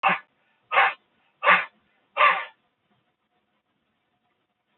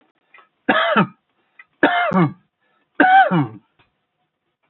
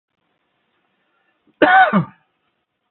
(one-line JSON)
{"exhalation_length": "4.8 s", "exhalation_amplitude": 21149, "exhalation_signal_mean_std_ratio": 0.31, "three_cough_length": "4.7 s", "three_cough_amplitude": 27730, "three_cough_signal_mean_std_ratio": 0.43, "cough_length": "2.9 s", "cough_amplitude": 30038, "cough_signal_mean_std_ratio": 0.3, "survey_phase": "beta (2021-08-13 to 2022-03-07)", "age": "45-64", "gender": "Male", "wearing_mask": "No", "symptom_runny_or_blocked_nose": true, "smoker_status": "Ex-smoker", "respiratory_condition_asthma": false, "respiratory_condition_other": false, "recruitment_source": "REACT", "submission_delay": "2 days", "covid_test_result": "Negative", "covid_test_method": "RT-qPCR"}